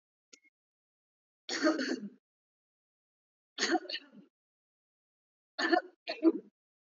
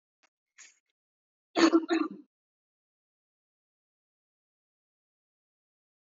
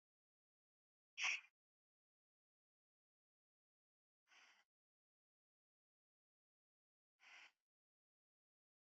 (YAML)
three_cough_length: 6.8 s
three_cough_amplitude: 7573
three_cough_signal_mean_std_ratio: 0.31
cough_length: 6.1 s
cough_amplitude: 9950
cough_signal_mean_std_ratio: 0.2
exhalation_length: 8.9 s
exhalation_amplitude: 1013
exhalation_signal_mean_std_ratio: 0.14
survey_phase: alpha (2021-03-01 to 2021-08-12)
age: 18-44
gender: Female
wearing_mask: 'Yes'
symptom_none: true
smoker_status: Never smoked
respiratory_condition_asthma: false
respiratory_condition_other: false
recruitment_source: REACT
submission_delay: 1 day
covid_test_result: Negative
covid_test_method: RT-qPCR